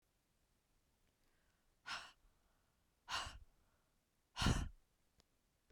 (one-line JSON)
{"exhalation_length": "5.7 s", "exhalation_amplitude": 2295, "exhalation_signal_mean_std_ratio": 0.27, "survey_phase": "beta (2021-08-13 to 2022-03-07)", "age": "65+", "gender": "Female", "wearing_mask": "No", "symptom_none": true, "smoker_status": "Ex-smoker", "respiratory_condition_asthma": false, "respiratory_condition_other": false, "recruitment_source": "REACT", "submission_delay": "3 days", "covid_test_result": "Negative", "covid_test_method": "RT-qPCR"}